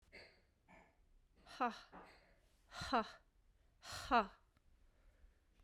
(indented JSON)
{
  "exhalation_length": "5.6 s",
  "exhalation_amplitude": 2538,
  "exhalation_signal_mean_std_ratio": 0.29,
  "survey_phase": "beta (2021-08-13 to 2022-03-07)",
  "age": "18-44",
  "gender": "Female",
  "wearing_mask": "No",
  "symptom_runny_or_blocked_nose": true,
  "symptom_onset": "3 days",
  "smoker_status": "Never smoked",
  "respiratory_condition_asthma": true,
  "respiratory_condition_other": false,
  "recruitment_source": "REACT",
  "submission_delay": "1 day",
  "covid_test_result": "Negative",
  "covid_test_method": "RT-qPCR",
  "influenza_a_test_result": "Negative",
  "influenza_b_test_result": "Negative"
}